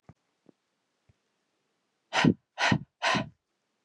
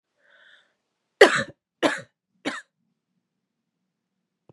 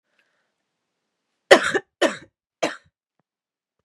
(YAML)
exhalation_length: 3.8 s
exhalation_amplitude: 13848
exhalation_signal_mean_std_ratio: 0.31
three_cough_length: 4.5 s
three_cough_amplitude: 32767
three_cough_signal_mean_std_ratio: 0.19
cough_length: 3.8 s
cough_amplitude: 32768
cough_signal_mean_std_ratio: 0.21
survey_phase: beta (2021-08-13 to 2022-03-07)
age: 18-44
gender: Female
wearing_mask: 'No'
symptom_runny_or_blocked_nose: true
symptom_sore_throat: true
symptom_abdominal_pain: true
symptom_fatigue: true
symptom_headache: true
smoker_status: Never smoked
respiratory_condition_asthma: false
respiratory_condition_other: false
recruitment_source: Test and Trace
submission_delay: 1 day
covid_test_result: Positive
covid_test_method: LFT